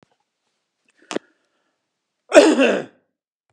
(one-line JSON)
{"cough_length": "3.5 s", "cough_amplitude": 32768, "cough_signal_mean_std_ratio": 0.28, "survey_phase": "beta (2021-08-13 to 2022-03-07)", "age": "65+", "gender": "Male", "wearing_mask": "No", "symptom_cough_any": true, "symptom_runny_or_blocked_nose": true, "symptom_onset": "13 days", "smoker_status": "Never smoked", "respiratory_condition_asthma": false, "respiratory_condition_other": false, "recruitment_source": "REACT", "submission_delay": "1 day", "covid_test_result": "Negative", "covid_test_method": "RT-qPCR", "covid_ct_value": 38.0, "covid_ct_gene": "N gene", "influenza_a_test_result": "Negative", "influenza_b_test_result": "Negative"}